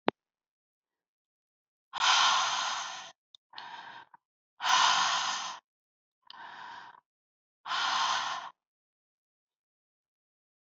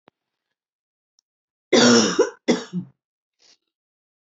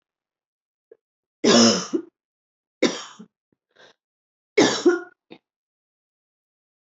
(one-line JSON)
{"exhalation_length": "10.7 s", "exhalation_amplitude": 18838, "exhalation_signal_mean_std_ratio": 0.41, "cough_length": "4.3 s", "cough_amplitude": 21663, "cough_signal_mean_std_ratio": 0.32, "three_cough_length": "7.0 s", "three_cough_amplitude": 22332, "three_cough_signal_mean_std_ratio": 0.29, "survey_phase": "beta (2021-08-13 to 2022-03-07)", "age": "45-64", "gender": "Female", "wearing_mask": "No", "symptom_new_continuous_cough": true, "symptom_fatigue": true, "symptom_change_to_sense_of_smell_or_taste": true, "symptom_loss_of_taste": true, "symptom_onset": "4 days", "smoker_status": "Never smoked", "respiratory_condition_asthma": false, "respiratory_condition_other": false, "recruitment_source": "Test and Trace", "submission_delay": "3 days", "covid_test_result": "Positive", "covid_test_method": "RT-qPCR"}